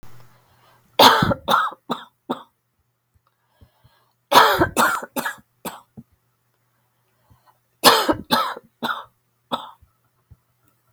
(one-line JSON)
{"three_cough_length": "10.9 s", "three_cough_amplitude": 32768, "three_cough_signal_mean_std_ratio": 0.33, "survey_phase": "beta (2021-08-13 to 2022-03-07)", "age": "45-64", "gender": "Female", "wearing_mask": "No", "symptom_fatigue": true, "symptom_headache": true, "symptom_onset": "12 days", "smoker_status": "Never smoked", "respiratory_condition_asthma": false, "respiratory_condition_other": false, "recruitment_source": "REACT", "submission_delay": "3 days", "covid_test_result": "Negative", "covid_test_method": "RT-qPCR"}